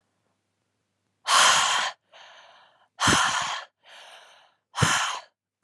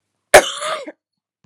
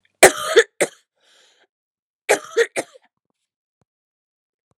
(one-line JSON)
{"exhalation_length": "5.6 s", "exhalation_amplitude": 16136, "exhalation_signal_mean_std_ratio": 0.44, "cough_length": "1.5 s", "cough_amplitude": 32768, "cough_signal_mean_std_ratio": 0.29, "three_cough_length": "4.8 s", "three_cough_amplitude": 32768, "three_cough_signal_mean_std_ratio": 0.24, "survey_phase": "alpha (2021-03-01 to 2021-08-12)", "age": "18-44", "gender": "Female", "wearing_mask": "No", "symptom_cough_any": true, "symptom_new_continuous_cough": true, "symptom_diarrhoea": true, "symptom_headache": true, "symptom_change_to_sense_of_smell_or_taste": true, "symptom_loss_of_taste": true, "symptom_onset": "3 days", "smoker_status": "Never smoked", "respiratory_condition_asthma": true, "respiratory_condition_other": false, "recruitment_source": "Test and Trace", "submission_delay": "2 days", "covid_test_result": "Positive", "covid_test_method": "RT-qPCR", "covid_ct_value": 16.8, "covid_ct_gene": "ORF1ab gene", "covid_ct_mean": 16.9, "covid_viral_load": "2800000 copies/ml", "covid_viral_load_category": "High viral load (>1M copies/ml)"}